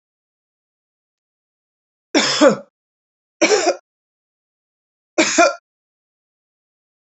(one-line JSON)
{"three_cough_length": "7.2 s", "three_cough_amplitude": 30256, "three_cough_signal_mean_std_ratio": 0.29, "survey_phase": "alpha (2021-03-01 to 2021-08-12)", "age": "45-64", "gender": "Female", "wearing_mask": "No", "symptom_none": true, "smoker_status": "Ex-smoker", "respiratory_condition_asthma": false, "respiratory_condition_other": false, "recruitment_source": "REACT", "submission_delay": "5 days", "covid_test_result": "Negative", "covid_test_method": "RT-qPCR"}